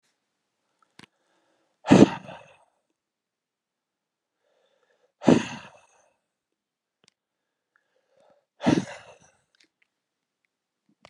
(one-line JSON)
{"exhalation_length": "11.1 s", "exhalation_amplitude": 31274, "exhalation_signal_mean_std_ratio": 0.17, "survey_phase": "alpha (2021-03-01 to 2021-08-12)", "age": "65+", "gender": "Male", "wearing_mask": "No", "symptom_none": true, "smoker_status": "Never smoked", "respiratory_condition_asthma": false, "respiratory_condition_other": false, "recruitment_source": "REACT", "submission_delay": "3 days", "covid_test_result": "Negative", "covid_test_method": "RT-qPCR"}